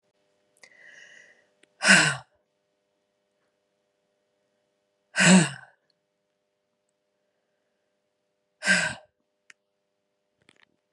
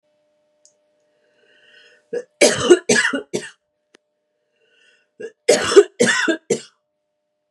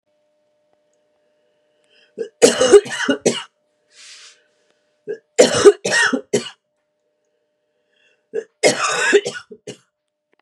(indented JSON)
{
  "exhalation_length": "10.9 s",
  "exhalation_amplitude": 25466,
  "exhalation_signal_mean_std_ratio": 0.22,
  "cough_length": "7.5 s",
  "cough_amplitude": 32768,
  "cough_signal_mean_std_ratio": 0.32,
  "three_cough_length": "10.4 s",
  "three_cough_amplitude": 32768,
  "three_cough_signal_mean_std_ratio": 0.33,
  "survey_phase": "beta (2021-08-13 to 2022-03-07)",
  "age": "45-64",
  "gender": "Female",
  "wearing_mask": "No",
  "symptom_cough_any": true,
  "symptom_runny_or_blocked_nose": true,
  "symptom_sore_throat": true,
  "symptom_fatigue": true,
  "symptom_onset": "8 days",
  "smoker_status": "Ex-smoker",
  "respiratory_condition_asthma": false,
  "respiratory_condition_other": false,
  "recruitment_source": "Test and Trace",
  "submission_delay": "2 days",
  "covid_test_result": "Positive",
  "covid_test_method": "RT-qPCR",
  "covid_ct_value": 13.6,
  "covid_ct_gene": "ORF1ab gene",
  "covid_ct_mean": 14.1,
  "covid_viral_load": "24000000 copies/ml",
  "covid_viral_load_category": "High viral load (>1M copies/ml)"
}